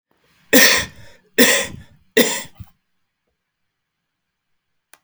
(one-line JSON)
{"three_cough_length": "5.0 s", "three_cough_amplitude": 32768, "three_cough_signal_mean_std_ratio": 0.32, "survey_phase": "alpha (2021-03-01 to 2021-08-12)", "age": "45-64", "gender": "Male", "wearing_mask": "No", "symptom_none": true, "smoker_status": "Never smoked", "respiratory_condition_asthma": false, "respiratory_condition_other": false, "recruitment_source": "REACT", "submission_delay": "10 days", "covid_test_result": "Negative", "covid_test_method": "RT-qPCR"}